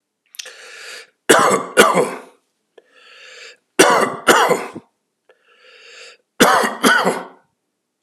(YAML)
three_cough_length: 8.0 s
three_cough_amplitude: 32768
three_cough_signal_mean_std_ratio: 0.42
survey_phase: alpha (2021-03-01 to 2021-08-12)
age: 65+
gender: Male
wearing_mask: 'No'
symptom_cough_any: true
symptom_fatigue: true
symptom_change_to_sense_of_smell_or_taste: true
symptom_loss_of_taste: true
symptom_onset: 9 days
smoker_status: Ex-smoker
respiratory_condition_asthma: false
respiratory_condition_other: false
recruitment_source: Test and Trace
submission_delay: 2 days
covid_test_result: Positive
covid_test_method: RT-qPCR
covid_ct_value: 22.1
covid_ct_gene: N gene
covid_ct_mean: 22.4
covid_viral_load: 46000 copies/ml
covid_viral_load_category: Low viral load (10K-1M copies/ml)